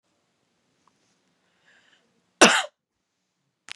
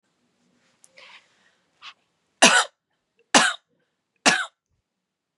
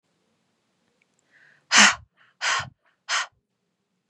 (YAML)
cough_length: 3.8 s
cough_amplitude: 32767
cough_signal_mean_std_ratio: 0.17
three_cough_length: 5.4 s
three_cough_amplitude: 32767
three_cough_signal_mean_std_ratio: 0.25
exhalation_length: 4.1 s
exhalation_amplitude: 28460
exhalation_signal_mean_std_ratio: 0.27
survey_phase: beta (2021-08-13 to 2022-03-07)
age: 18-44
gender: Female
wearing_mask: 'No'
symptom_cough_any: true
symptom_runny_or_blocked_nose: true
symptom_sore_throat: true
symptom_headache: true
smoker_status: Never smoked
respiratory_condition_asthma: false
respiratory_condition_other: false
recruitment_source: Test and Trace
submission_delay: 1 day
covid_test_result: Positive
covid_test_method: RT-qPCR